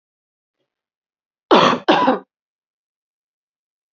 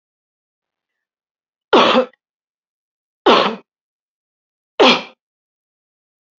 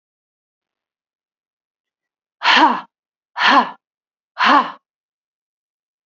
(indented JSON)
{
  "cough_length": "3.9 s",
  "cough_amplitude": 31646,
  "cough_signal_mean_std_ratio": 0.3,
  "three_cough_length": "6.4 s",
  "three_cough_amplitude": 30050,
  "three_cough_signal_mean_std_ratio": 0.28,
  "exhalation_length": "6.1 s",
  "exhalation_amplitude": 32767,
  "exhalation_signal_mean_std_ratio": 0.31,
  "survey_phase": "beta (2021-08-13 to 2022-03-07)",
  "age": "45-64",
  "gender": "Female",
  "wearing_mask": "No",
  "symptom_runny_or_blocked_nose": true,
  "smoker_status": "Never smoked",
  "respiratory_condition_asthma": true,
  "respiratory_condition_other": false,
  "recruitment_source": "REACT",
  "submission_delay": "2 days",
  "covid_test_result": "Negative",
  "covid_test_method": "RT-qPCR",
  "influenza_a_test_result": "Negative",
  "influenza_b_test_result": "Negative"
}